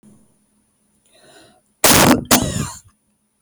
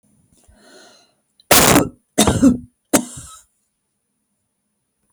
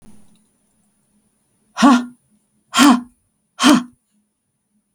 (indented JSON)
{
  "cough_length": "3.4 s",
  "cough_amplitude": 32768,
  "cough_signal_mean_std_ratio": 0.36,
  "three_cough_length": "5.1 s",
  "three_cough_amplitude": 32768,
  "three_cough_signal_mean_std_ratio": 0.32,
  "exhalation_length": "4.9 s",
  "exhalation_amplitude": 32768,
  "exhalation_signal_mean_std_ratio": 0.31,
  "survey_phase": "beta (2021-08-13 to 2022-03-07)",
  "age": "45-64",
  "gender": "Female",
  "wearing_mask": "No",
  "symptom_none": true,
  "smoker_status": "Never smoked",
  "respiratory_condition_asthma": false,
  "respiratory_condition_other": false,
  "recruitment_source": "REACT",
  "submission_delay": "4 days",
  "covid_test_result": "Negative",
  "covid_test_method": "RT-qPCR",
  "influenza_a_test_result": "Negative",
  "influenza_b_test_result": "Negative"
}